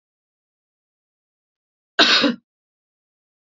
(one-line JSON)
{"cough_length": "3.4 s", "cough_amplitude": 29263, "cough_signal_mean_std_ratio": 0.25, "survey_phase": "alpha (2021-03-01 to 2021-08-12)", "age": "45-64", "gender": "Female", "wearing_mask": "No", "symptom_none": true, "smoker_status": "Ex-smoker", "respiratory_condition_asthma": true, "respiratory_condition_other": false, "recruitment_source": "REACT", "submission_delay": "8 days", "covid_test_result": "Negative", "covid_test_method": "RT-qPCR"}